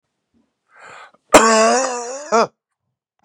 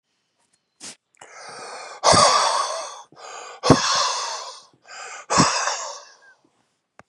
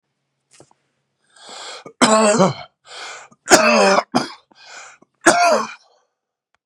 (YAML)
cough_length: 3.2 s
cough_amplitude: 32768
cough_signal_mean_std_ratio: 0.41
exhalation_length: 7.1 s
exhalation_amplitude: 32767
exhalation_signal_mean_std_ratio: 0.45
three_cough_length: 6.7 s
three_cough_amplitude: 32768
three_cough_signal_mean_std_ratio: 0.41
survey_phase: beta (2021-08-13 to 2022-03-07)
age: 45-64
gender: Male
wearing_mask: 'Yes'
symptom_cough_any: true
symptom_runny_or_blocked_nose: true
symptom_change_to_sense_of_smell_or_taste: true
smoker_status: Ex-smoker
respiratory_condition_asthma: false
respiratory_condition_other: false
recruitment_source: REACT
submission_delay: 1 day
covid_test_result: Negative
covid_test_method: RT-qPCR
influenza_a_test_result: Positive
influenza_a_ct_value: 34.2
influenza_b_test_result: Negative